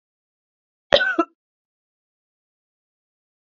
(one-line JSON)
{"cough_length": "3.6 s", "cough_amplitude": 31635, "cough_signal_mean_std_ratio": 0.19, "survey_phase": "beta (2021-08-13 to 2022-03-07)", "age": "45-64", "gender": "Female", "wearing_mask": "No", "symptom_runny_or_blocked_nose": true, "symptom_shortness_of_breath": true, "symptom_sore_throat": true, "symptom_fatigue": true, "symptom_headache": true, "symptom_onset": "3 days", "smoker_status": "Never smoked", "respiratory_condition_asthma": true, "respiratory_condition_other": false, "recruitment_source": "Test and Trace", "submission_delay": "0 days", "covid_test_result": "Positive", "covid_test_method": "RT-qPCR", "covid_ct_value": 18.1, "covid_ct_gene": "N gene"}